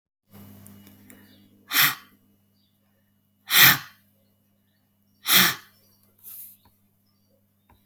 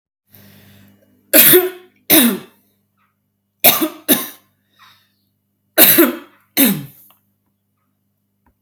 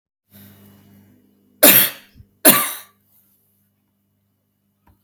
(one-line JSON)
{"exhalation_length": "7.9 s", "exhalation_amplitude": 32768, "exhalation_signal_mean_std_ratio": 0.25, "three_cough_length": "8.6 s", "three_cough_amplitude": 32768, "three_cough_signal_mean_std_ratio": 0.34, "cough_length": "5.0 s", "cough_amplitude": 32768, "cough_signal_mean_std_ratio": 0.25, "survey_phase": "alpha (2021-03-01 to 2021-08-12)", "age": "18-44", "gender": "Female", "wearing_mask": "No", "symptom_none": true, "smoker_status": "Current smoker (11 or more cigarettes per day)", "respiratory_condition_asthma": false, "respiratory_condition_other": false, "recruitment_source": "REACT", "submission_delay": "1 day", "covid_test_result": "Negative", "covid_test_method": "RT-qPCR"}